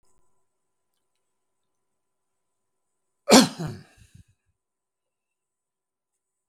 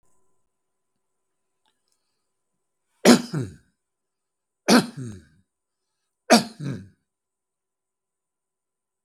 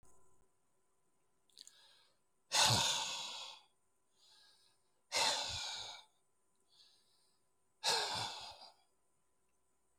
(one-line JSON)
{"cough_length": "6.5 s", "cough_amplitude": 32768, "cough_signal_mean_std_ratio": 0.15, "three_cough_length": "9.0 s", "three_cough_amplitude": 32768, "three_cough_signal_mean_std_ratio": 0.2, "exhalation_length": "10.0 s", "exhalation_amplitude": 4492, "exhalation_signal_mean_std_ratio": 0.37, "survey_phase": "beta (2021-08-13 to 2022-03-07)", "age": "65+", "gender": "Male", "wearing_mask": "No", "symptom_none": true, "smoker_status": "Never smoked", "respiratory_condition_asthma": false, "respiratory_condition_other": false, "recruitment_source": "REACT", "submission_delay": "2 days", "covid_test_result": "Negative", "covid_test_method": "RT-qPCR", "influenza_a_test_result": "Unknown/Void", "influenza_b_test_result": "Unknown/Void"}